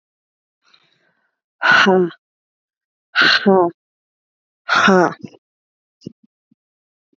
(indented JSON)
{
  "exhalation_length": "7.2 s",
  "exhalation_amplitude": 27906,
  "exhalation_signal_mean_std_ratio": 0.36,
  "survey_phase": "beta (2021-08-13 to 2022-03-07)",
  "age": "18-44",
  "gender": "Female",
  "wearing_mask": "No",
  "symptom_cough_any": true,
  "symptom_fatigue": true,
  "symptom_headache": true,
  "symptom_onset": "10 days",
  "smoker_status": "Current smoker (1 to 10 cigarettes per day)",
  "respiratory_condition_asthma": false,
  "respiratory_condition_other": false,
  "recruitment_source": "REACT",
  "submission_delay": "2 days",
  "covid_test_result": "Negative",
  "covid_test_method": "RT-qPCR",
  "influenza_a_test_result": "Negative",
  "influenza_b_test_result": "Negative"
}